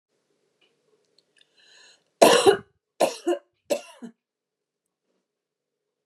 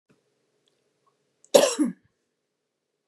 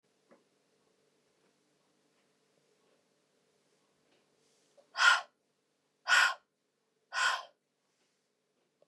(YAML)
three_cough_length: 6.1 s
three_cough_amplitude: 30159
three_cough_signal_mean_std_ratio: 0.24
cough_length: 3.1 s
cough_amplitude: 29369
cough_signal_mean_std_ratio: 0.22
exhalation_length: 8.9 s
exhalation_amplitude: 8328
exhalation_signal_mean_std_ratio: 0.22
survey_phase: beta (2021-08-13 to 2022-03-07)
age: 18-44
gender: Female
wearing_mask: 'No'
symptom_none: true
smoker_status: Ex-smoker
respiratory_condition_asthma: false
respiratory_condition_other: false
recruitment_source: Test and Trace
submission_delay: -1 day
covid_test_result: Negative
covid_test_method: LFT